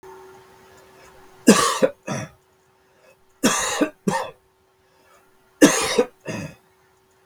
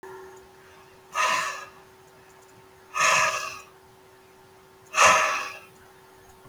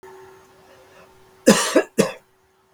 {"three_cough_length": "7.3 s", "three_cough_amplitude": 32768, "three_cough_signal_mean_std_ratio": 0.35, "exhalation_length": "6.5 s", "exhalation_amplitude": 19870, "exhalation_signal_mean_std_ratio": 0.41, "cough_length": "2.7 s", "cough_amplitude": 32768, "cough_signal_mean_std_ratio": 0.31, "survey_phase": "beta (2021-08-13 to 2022-03-07)", "age": "65+", "gender": "Male", "wearing_mask": "No", "symptom_shortness_of_breath": true, "symptom_fatigue": true, "smoker_status": "Never smoked", "respiratory_condition_asthma": false, "respiratory_condition_other": false, "recruitment_source": "REACT", "submission_delay": "1 day", "covid_test_result": "Negative", "covid_test_method": "RT-qPCR"}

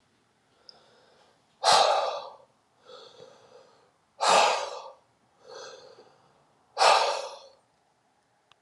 {"exhalation_length": "8.6 s", "exhalation_amplitude": 15241, "exhalation_signal_mean_std_ratio": 0.35, "survey_phase": "alpha (2021-03-01 to 2021-08-12)", "age": "18-44", "gender": "Male", "wearing_mask": "No", "symptom_cough_any": true, "symptom_fatigue": true, "symptom_headache": true, "symptom_onset": "4 days", "smoker_status": "Never smoked", "respiratory_condition_asthma": false, "respiratory_condition_other": false, "recruitment_source": "Test and Trace", "submission_delay": "2 days", "covid_test_result": "Positive", "covid_test_method": "RT-qPCR"}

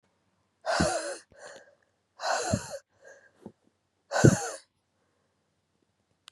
{"exhalation_length": "6.3 s", "exhalation_amplitude": 29144, "exhalation_signal_mean_std_ratio": 0.31, "survey_phase": "beta (2021-08-13 to 2022-03-07)", "age": "18-44", "gender": "Female", "wearing_mask": "No", "symptom_cough_any": true, "symptom_runny_or_blocked_nose": true, "symptom_shortness_of_breath": true, "symptom_sore_throat": true, "symptom_abdominal_pain": true, "symptom_fatigue": true, "symptom_fever_high_temperature": true, "symptom_headache": true, "symptom_other": true, "symptom_onset": "3 days", "smoker_status": "Current smoker (1 to 10 cigarettes per day)", "respiratory_condition_asthma": false, "respiratory_condition_other": false, "recruitment_source": "Test and Trace", "submission_delay": "1 day", "covid_test_result": "Positive", "covid_test_method": "RT-qPCR", "covid_ct_value": 19.7, "covid_ct_gene": "ORF1ab gene", "covid_ct_mean": 20.2, "covid_viral_load": "230000 copies/ml", "covid_viral_load_category": "Low viral load (10K-1M copies/ml)"}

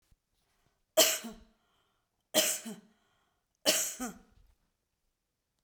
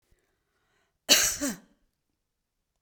{"three_cough_length": "5.6 s", "three_cough_amplitude": 10808, "three_cough_signal_mean_std_ratio": 0.29, "cough_length": "2.8 s", "cough_amplitude": 20499, "cough_signal_mean_std_ratio": 0.27, "survey_phase": "beta (2021-08-13 to 2022-03-07)", "age": "65+", "gender": "Female", "wearing_mask": "No", "symptom_none": true, "smoker_status": "Never smoked", "respiratory_condition_asthma": true, "respiratory_condition_other": true, "recruitment_source": "REACT", "submission_delay": "0 days", "covid_test_result": "Negative", "covid_test_method": "RT-qPCR"}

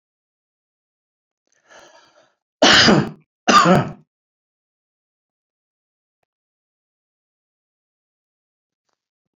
{"cough_length": "9.4 s", "cough_amplitude": 32768, "cough_signal_mean_std_ratio": 0.24, "survey_phase": "beta (2021-08-13 to 2022-03-07)", "age": "65+", "gender": "Male", "wearing_mask": "No", "symptom_none": true, "smoker_status": "Never smoked", "respiratory_condition_asthma": false, "respiratory_condition_other": false, "recruitment_source": "REACT", "submission_delay": "3 days", "covid_test_result": "Negative", "covid_test_method": "RT-qPCR"}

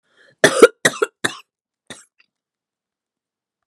{"cough_length": "3.7 s", "cough_amplitude": 32768, "cough_signal_mean_std_ratio": 0.21, "survey_phase": "beta (2021-08-13 to 2022-03-07)", "age": "45-64", "gender": "Female", "wearing_mask": "No", "symptom_cough_any": true, "symptom_runny_or_blocked_nose": true, "symptom_sore_throat": true, "symptom_fatigue": true, "symptom_headache": true, "symptom_onset": "5 days", "smoker_status": "Current smoker (1 to 10 cigarettes per day)", "respiratory_condition_asthma": false, "respiratory_condition_other": false, "recruitment_source": "Test and Trace", "submission_delay": "2 days", "covid_test_result": "Positive", "covid_test_method": "RT-qPCR", "covid_ct_value": 27.2, "covid_ct_gene": "N gene"}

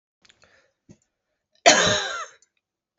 {"cough_length": "3.0 s", "cough_amplitude": 28706, "cough_signal_mean_std_ratio": 0.29, "survey_phase": "beta (2021-08-13 to 2022-03-07)", "age": "45-64", "gender": "Female", "wearing_mask": "No", "symptom_runny_or_blocked_nose": true, "smoker_status": "Never smoked", "respiratory_condition_asthma": false, "respiratory_condition_other": false, "recruitment_source": "Test and Trace", "submission_delay": "2 days", "covid_test_result": "Positive", "covid_test_method": "LFT"}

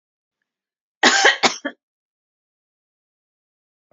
{"cough_length": "3.9 s", "cough_amplitude": 32392, "cough_signal_mean_std_ratio": 0.26, "survey_phase": "beta (2021-08-13 to 2022-03-07)", "age": "45-64", "gender": "Female", "wearing_mask": "No", "symptom_headache": true, "smoker_status": "Never smoked", "respiratory_condition_asthma": false, "respiratory_condition_other": false, "recruitment_source": "REACT", "submission_delay": "3 days", "covid_test_result": "Negative", "covid_test_method": "RT-qPCR", "influenza_a_test_result": "Negative", "influenza_b_test_result": "Negative"}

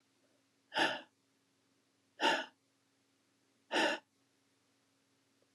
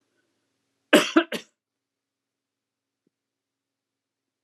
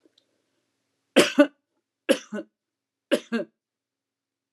{"exhalation_length": "5.5 s", "exhalation_amplitude": 3858, "exhalation_signal_mean_std_ratio": 0.29, "cough_length": "4.4 s", "cough_amplitude": 29166, "cough_signal_mean_std_ratio": 0.17, "three_cough_length": "4.5 s", "three_cough_amplitude": 25923, "three_cough_signal_mean_std_ratio": 0.24, "survey_phase": "beta (2021-08-13 to 2022-03-07)", "age": "45-64", "gender": "Female", "wearing_mask": "No", "symptom_none": true, "smoker_status": "Never smoked", "respiratory_condition_asthma": false, "respiratory_condition_other": false, "recruitment_source": "REACT", "submission_delay": "2 days", "covid_test_result": "Negative", "covid_test_method": "RT-qPCR", "influenza_a_test_result": "Negative", "influenza_b_test_result": "Negative"}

